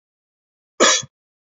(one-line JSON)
{"cough_length": "1.5 s", "cough_amplitude": 28161, "cough_signal_mean_std_ratio": 0.29, "survey_phase": "beta (2021-08-13 to 2022-03-07)", "age": "45-64", "gender": "Male", "wearing_mask": "No", "symptom_none": true, "smoker_status": "Ex-smoker", "respiratory_condition_asthma": false, "respiratory_condition_other": false, "recruitment_source": "REACT", "submission_delay": "8 days", "covid_test_result": "Negative", "covid_test_method": "RT-qPCR", "influenza_a_test_result": "Negative", "influenza_b_test_result": "Negative"}